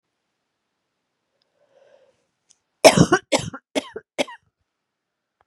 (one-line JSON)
{"cough_length": "5.5 s", "cough_amplitude": 32768, "cough_signal_mean_std_ratio": 0.2, "survey_phase": "beta (2021-08-13 to 2022-03-07)", "age": "18-44", "gender": "Female", "wearing_mask": "No", "symptom_new_continuous_cough": true, "symptom_sore_throat": true, "symptom_diarrhoea": true, "symptom_fatigue": true, "symptom_fever_high_temperature": true, "symptom_other": true, "smoker_status": "Never smoked", "respiratory_condition_asthma": false, "respiratory_condition_other": false, "recruitment_source": "Test and Trace", "submission_delay": "2 days", "covid_test_result": "Positive", "covid_test_method": "LFT"}